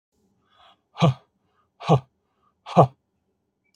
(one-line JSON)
{"exhalation_length": "3.8 s", "exhalation_amplitude": 26165, "exhalation_signal_mean_std_ratio": 0.25, "survey_phase": "alpha (2021-03-01 to 2021-08-12)", "age": "45-64", "gender": "Male", "wearing_mask": "No", "symptom_none": true, "smoker_status": "Ex-smoker", "respiratory_condition_asthma": false, "respiratory_condition_other": false, "recruitment_source": "REACT", "submission_delay": "1 day", "covid_test_result": "Negative", "covid_test_method": "RT-qPCR"}